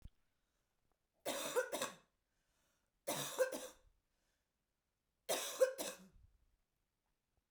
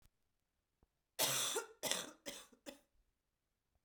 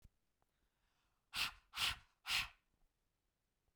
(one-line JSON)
{"three_cough_length": "7.5 s", "three_cough_amplitude": 2927, "three_cough_signal_mean_std_ratio": 0.34, "cough_length": "3.8 s", "cough_amplitude": 5633, "cough_signal_mean_std_ratio": 0.37, "exhalation_length": "3.8 s", "exhalation_amplitude": 1876, "exhalation_signal_mean_std_ratio": 0.31, "survey_phase": "beta (2021-08-13 to 2022-03-07)", "age": "18-44", "gender": "Female", "wearing_mask": "No", "symptom_cough_any": true, "symptom_runny_or_blocked_nose": true, "symptom_diarrhoea": true, "smoker_status": "Current smoker (e-cigarettes or vapes only)", "respiratory_condition_asthma": true, "respiratory_condition_other": false, "recruitment_source": "Test and Trace", "submission_delay": "2 days", "covid_test_result": "Positive", "covid_test_method": "RT-qPCR", "covid_ct_value": 23.4, "covid_ct_gene": "ORF1ab gene", "covid_ct_mean": 24.1, "covid_viral_load": "12000 copies/ml", "covid_viral_load_category": "Low viral load (10K-1M copies/ml)"}